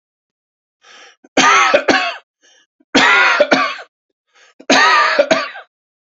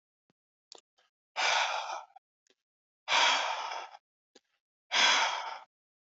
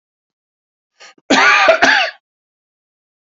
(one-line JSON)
{"three_cough_length": "6.1 s", "three_cough_amplitude": 32767, "three_cough_signal_mean_std_ratio": 0.51, "exhalation_length": "6.1 s", "exhalation_amplitude": 7396, "exhalation_signal_mean_std_ratio": 0.44, "cough_length": "3.3 s", "cough_amplitude": 30782, "cough_signal_mean_std_ratio": 0.4, "survey_phase": "alpha (2021-03-01 to 2021-08-12)", "age": "65+", "gender": "Male", "wearing_mask": "No", "symptom_none": true, "smoker_status": "Never smoked", "respiratory_condition_asthma": false, "respiratory_condition_other": false, "recruitment_source": "REACT", "submission_delay": "1 day", "covid_test_result": "Negative", "covid_test_method": "RT-qPCR"}